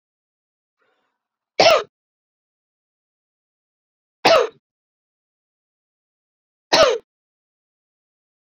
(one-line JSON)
{"three_cough_length": "8.4 s", "three_cough_amplitude": 29833, "three_cough_signal_mean_std_ratio": 0.23, "survey_phase": "beta (2021-08-13 to 2022-03-07)", "age": "18-44", "gender": "Female", "wearing_mask": "No", "symptom_cough_any": true, "symptom_runny_or_blocked_nose": true, "symptom_shortness_of_breath": true, "symptom_fatigue": true, "symptom_change_to_sense_of_smell_or_taste": true, "symptom_other": true, "smoker_status": "Never smoked", "respiratory_condition_asthma": false, "respiratory_condition_other": false, "recruitment_source": "Test and Trace", "submission_delay": "3 days", "covid_test_result": "Positive", "covid_test_method": "RT-qPCR", "covid_ct_value": 27.2, "covid_ct_gene": "N gene"}